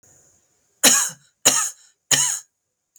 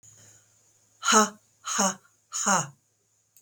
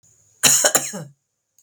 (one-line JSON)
{"three_cough_length": "3.0 s", "three_cough_amplitude": 32768, "three_cough_signal_mean_std_ratio": 0.38, "exhalation_length": "3.4 s", "exhalation_amplitude": 17296, "exhalation_signal_mean_std_ratio": 0.38, "cough_length": "1.6 s", "cough_amplitude": 32768, "cough_signal_mean_std_ratio": 0.4, "survey_phase": "beta (2021-08-13 to 2022-03-07)", "age": "45-64", "gender": "Female", "wearing_mask": "No", "symptom_cough_any": true, "symptom_runny_or_blocked_nose": true, "smoker_status": "Ex-smoker", "respiratory_condition_asthma": false, "respiratory_condition_other": false, "recruitment_source": "REACT", "submission_delay": "1 day", "covid_test_result": "Negative", "covid_test_method": "RT-qPCR"}